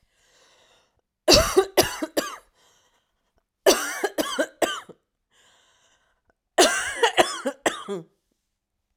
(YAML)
three_cough_length: 9.0 s
three_cough_amplitude: 31527
three_cough_signal_mean_std_ratio: 0.36
survey_phase: alpha (2021-03-01 to 2021-08-12)
age: 45-64
gender: Female
wearing_mask: 'No'
symptom_none: true
symptom_fatigue: true
smoker_status: Ex-smoker
respiratory_condition_asthma: false
respiratory_condition_other: false
recruitment_source: REACT
submission_delay: 5 days
covid_test_result: Negative
covid_test_method: RT-qPCR